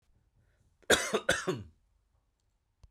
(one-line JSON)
{"cough_length": "2.9 s", "cough_amplitude": 10851, "cough_signal_mean_std_ratio": 0.31, "survey_phase": "beta (2021-08-13 to 2022-03-07)", "age": "45-64", "gender": "Male", "wearing_mask": "No", "symptom_none": true, "smoker_status": "Never smoked", "respiratory_condition_asthma": false, "respiratory_condition_other": false, "recruitment_source": "REACT", "submission_delay": "1 day", "covid_test_result": "Negative", "covid_test_method": "RT-qPCR"}